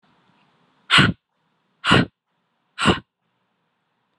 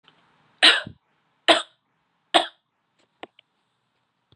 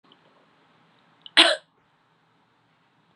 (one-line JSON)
{"exhalation_length": "4.2 s", "exhalation_amplitude": 30698, "exhalation_signal_mean_std_ratio": 0.29, "three_cough_length": "4.4 s", "three_cough_amplitude": 31637, "three_cough_signal_mean_std_ratio": 0.22, "cough_length": "3.2 s", "cough_amplitude": 28746, "cough_signal_mean_std_ratio": 0.19, "survey_phase": "beta (2021-08-13 to 2022-03-07)", "age": "18-44", "gender": "Female", "wearing_mask": "No", "symptom_none": true, "smoker_status": "Current smoker (1 to 10 cigarettes per day)", "respiratory_condition_asthma": false, "respiratory_condition_other": false, "recruitment_source": "REACT", "submission_delay": "1 day", "covid_test_result": "Negative", "covid_test_method": "RT-qPCR"}